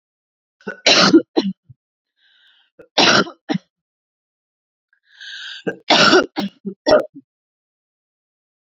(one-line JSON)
{"three_cough_length": "8.6 s", "three_cough_amplitude": 32767, "three_cough_signal_mean_std_ratio": 0.34, "survey_phase": "beta (2021-08-13 to 2022-03-07)", "age": "45-64", "gender": "Female", "wearing_mask": "No", "symptom_cough_any": true, "symptom_new_continuous_cough": true, "symptom_runny_or_blocked_nose": true, "symptom_sore_throat": true, "symptom_fatigue": true, "symptom_fever_high_temperature": true, "symptom_headache": true, "symptom_onset": "2 days", "smoker_status": "Ex-smoker", "respiratory_condition_asthma": false, "respiratory_condition_other": false, "recruitment_source": "Test and Trace", "submission_delay": "2 days", "covid_test_result": "Positive", "covid_test_method": "RT-qPCR"}